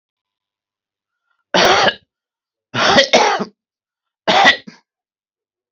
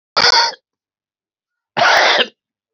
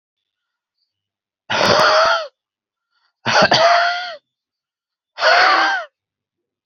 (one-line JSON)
{"three_cough_length": "5.7 s", "three_cough_amplitude": 31456, "three_cough_signal_mean_std_ratio": 0.39, "cough_length": "2.7 s", "cough_amplitude": 32471, "cough_signal_mean_std_ratio": 0.46, "exhalation_length": "6.7 s", "exhalation_amplitude": 31678, "exhalation_signal_mean_std_ratio": 0.48, "survey_phase": "beta (2021-08-13 to 2022-03-07)", "age": "45-64", "gender": "Female", "wearing_mask": "No", "symptom_none": true, "smoker_status": "Current smoker (1 to 10 cigarettes per day)", "respiratory_condition_asthma": false, "respiratory_condition_other": false, "recruitment_source": "REACT", "submission_delay": "1 day", "covid_test_result": "Negative", "covid_test_method": "RT-qPCR"}